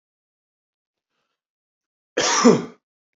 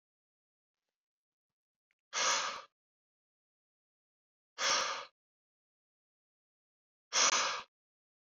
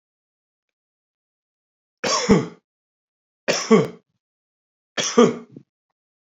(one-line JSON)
{"cough_length": "3.2 s", "cough_amplitude": 25987, "cough_signal_mean_std_ratio": 0.28, "exhalation_length": "8.4 s", "exhalation_amplitude": 4931, "exhalation_signal_mean_std_ratio": 0.3, "three_cough_length": "6.4 s", "three_cough_amplitude": 26908, "three_cough_signal_mean_std_ratio": 0.29, "survey_phase": "beta (2021-08-13 to 2022-03-07)", "age": "18-44", "gender": "Male", "wearing_mask": "No", "symptom_none": true, "smoker_status": "Current smoker (e-cigarettes or vapes only)", "respiratory_condition_asthma": false, "respiratory_condition_other": false, "recruitment_source": "REACT", "submission_delay": "1 day", "covid_test_result": "Negative", "covid_test_method": "RT-qPCR", "influenza_a_test_result": "Negative", "influenza_b_test_result": "Negative"}